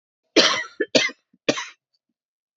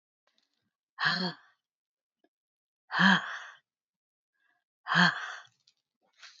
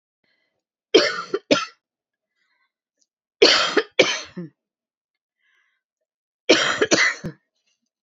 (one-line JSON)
{"cough_length": "2.6 s", "cough_amplitude": 31803, "cough_signal_mean_std_ratio": 0.35, "exhalation_length": "6.4 s", "exhalation_amplitude": 10039, "exhalation_signal_mean_std_ratio": 0.3, "three_cough_length": "8.0 s", "three_cough_amplitude": 27778, "three_cough_signal_mean_std_ratio": 0.33, "survey_phase": "beta (2021-08-13 to 2022-03-07)", "age": "45-64", "gender": "Female", "wearing_mask": "No", "symptom_cough_any": true, "symptom_runny_or_blocked_nose": true, "symptom_sore_throat": true, "symptom_headache": true, "symptom_other": true, "symptom_onset": "2 days", "smoker_status": "Never smoked", "respiratory_condition_asthma": false, "respiratory_condition_other": false, "recruitment_source": "Test and Trace", "submission_delay": "1 day", "covid_test_result": "Positive", "covid_test_method": "RT-qPCR", "covid_ct_value": 21.0, "covid_ct_gene": "N gene"}